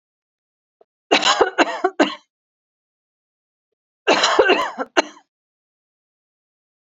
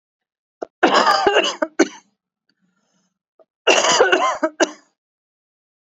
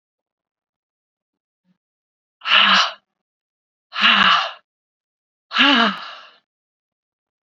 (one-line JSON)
{"three_cough_length": "6.8 s", "three_cough_amplitude": 28679, "three_cough_signal_mean_std_ratio": 0.34, "cough_length": "5.9 s", "cough_amplitude": 32767, "cough_signal_mean_std_ratio": 0.42, "exhalation_length": "7.4 s", "exhalation_amplitude": 28786, "exhalation_signal_mean_std_ratio": 0.35, "survey_phase": "beta (2021-08-13 to 2022-03-07)", "age": "45-64", "gender": "Female", "wearing_mask": "No", "symptom_cough_any": true, "symptom_runny_or_blocked_nose": true, "symptom_fatigue": true, "smoker_status": "Ex-smoker", "respiratory_condition_asthma": false, "respiratory_condition_other": false, "recruitment_source": "Test and Trace", "submission_delay": "1 day", "covid_test_result": "Positive", "covid_test_method": "LFT"}